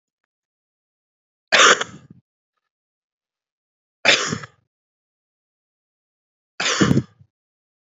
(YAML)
three_cough_length: 7.9 s
three_cough_amplitude: 32768
three_cough_signal_mean_std_ratio: 0.26
survey_phase: beta (2021-08-13 to 2022-03-07)
age: 18-44
gender: Male
wearing_mask: 'No'
symptom_cough_any: true
symptom_runny_or_blocked_nose: true
symptom_diarrhoea: true
symptom_onset: 4 days
smoker_status: Current smoker (e-cigarettes or vapes only)
respiratory_condition_asthma: false
respiratory_condition_other: false
recruitment_source: Test and Trace
submission_delay: 2 days
covid_test_result: Positive
covid_test_method: RT-qPCR
covid_ct_value: 13.2
covid_ct_gene: ORF1ab gene
covid_ct_mean: 13.5
covid_viral_load: 38000000 copies/ml
covid_viral_load_category: High viral load (>1M copies/ml)